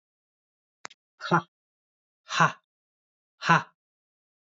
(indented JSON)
{
  "exhalation_length": "4.5 s",
  "exhalation_amplitude": 18858,
  "exhalation_signal_mean_std_ratio": 0.23,
  "survey_phase": "beta (2021-08-13 to 2022-03-07)",
  "age": "18-44",
  "gender": "Male",
  "wearing_mask": "No",
  "symptom_cough_any": true,
  "symptom_runny_or_blocked_nose": true,
  "symptom_fatigue": true,
  "symptom_headache": true,
  "smoker_status": "Never smoked",
  "respiratory_condition_asthma": false,
  "respiratory_condition_other": false,
  "recruitment_source": "Test and Trace",
  "submission_delay": "2 days",
  "covid_test_result": "Positive",
  "covid_test_method": "RT-qPCR",
  "covid_ct_value": 22.6,
  "covid_ct_gene": "N gene"
}